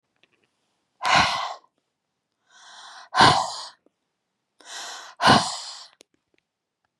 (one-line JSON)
{"exhalation_length": "7.0 s", "exhalation_amplitude": 26586, "exhalation_signal_mean_std_ratio": 0.32, "survey_phase": "beta (2021-08-13 to 2022-03-07)", "age": "45-64", "gender": "Female", "wearing_mask": "No", "symptom_none": true, "smoker_status": "Never smoked", "respiratory_condition_asthma": false, "respiratory_condition_other": false, "recruitment_source": "REACT", "submission_delay": "2 days", "covid_test_result": "Negative", "covid_test_method": "RT-qPCR", "influenza_a_test_result": "Negative", "influenza_b_test_result": "Negative"}